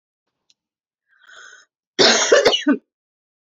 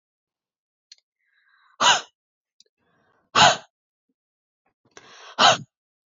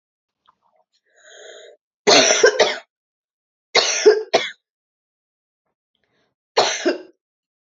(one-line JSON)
{"cough_length": "3.4 s", "cough_amplitude": 30776, "cough_signal_mean_std_ratio": 0.37, "exhalation_length": "6.1 s", "exhalation_amplitude": 26272, "exhalation_signal_mean_std_ratio": 0.24, "three_cough_length": "7.7 s", "three_cough_amplitude": 31301, "three_cough_signal_mean_std_ratio": 0.34, "survey_phase": "beta (2021-08-13 to 2022-03-07)", "age": "18-44", "gender": "Female", "wearing_mask": "No", "symptom_cough_any": true, "symptom_new_continuous_cough": true, "symptom_runny_or_blocked_nose": true, "symptom_sore_throat": true, "symptom_fatigue": true, "symptom_onset": "5 days", "smoker_status": "Never smoked", "respiratory_condition_asthma": false, "respiratory_condition_other": false, "recruitment_source": "Test and Trace", "submission_delay": "2 days", "covid_test_result": "Positive", "covid_test_method": "RT-qPCR", "covid_ct_value": 15.0, "covid_ct_gene": "ORF1ab gene", "covid_ct_mean": 15.2, "covid_viral_load": "10000000 copies/ml", "covid_viral_load_category": "High viral load (>1M copies/ml)"}